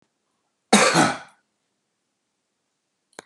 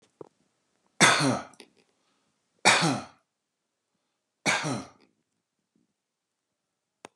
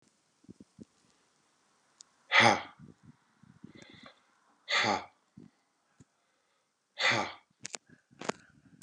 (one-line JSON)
{"cough_length": "3.3 s", "cough_amplitude": 27200, "cough_signal_mean_std_ratio": 0.28, "three_cough_length": "7.2 s", "three_cough_amplitude": 24481, "three_cough_signal_mean_std_ratio": 0.29, "exhalation_length": "8.8 s", "exhalation_amplitude": 11079, "exhalation_signal_mean_std_ratio": 0.26, "survey_phase": "beta (2021-08-13 to 2022-03-07)", "age": "45-64", "gender": "Male", "wearing_mask": "No", "symptom_fatigue": true, "symptom_onset": "13 days", "smoker_status": "Current smoker (11 or more cigarettes per day)", "respiratory_condition_asthma": false, "respiratory_condition_other": false, "recruitment_source": "REACT", "submission_delay": "1 day", "covid_test_result": "Negative", "covid_test_method": "RT-qPCR", "influenza_a_test_result": "Negative", "influenza_b_test_result": "Negative"}